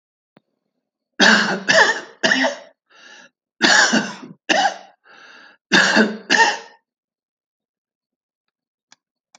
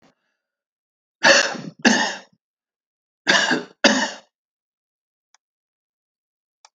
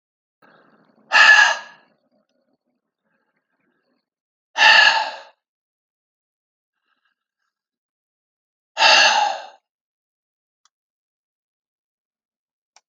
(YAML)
cough_length: 9.4 s
cough_amplitude: 31047
cough_signal_mean_std_ratio: 0.41
three_cough_length: 6.7 s
three_cough_amplitude: 32767
three_cough_signal_mean_std_ratio: 0.32
exhalation_length: 12.9 s
exhalation_amplitude: 31564
exhalation_signal_mean_std_ratio: 0.27
survey_phase: alpha (2021-03-01 to 2021-08-12)
age: 65+
gender: Male
wearing_mask: 'No'
symptom_none: true
smoker_status: Ex-smoker
respiratory_condition_asthma: false
respiratory_condition_other: false
recruitment_source: REACT
submission_delay: 2 days
covid_test_result: Negative
covid_test_method: RT-qPCR